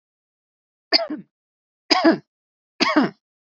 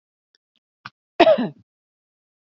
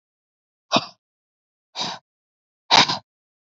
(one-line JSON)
{"three_cough_length": "3.4 s", "three_cough_amplitude": 32768, "three_cough_signal_mean_std_ratio": 0.34, "cough_length": "2.6 s", "cough_amplitude": 28682, "cough_signal_mean_std_ratio": 0.24, "exhalation_length": "3.5 s", "exhalation_amplitude": 31180, "exhalation_signal_mean_std_ratio": 0.25, "survey_phase": "alpha (2021-03-01 to 2021-08-12)", "age": "18-44", "gender": "Female", "wearing_mask": "No", "symptom_none": true, "smoker_status": "Never smoked", "respiratory_condition_asthma": false, "respiratory_condition_other": false, "recruitment_source": "REACT", "submission_delay": "1 day", "covid_test_result": "Negative", "covid_test_method": "RT-qPCR"}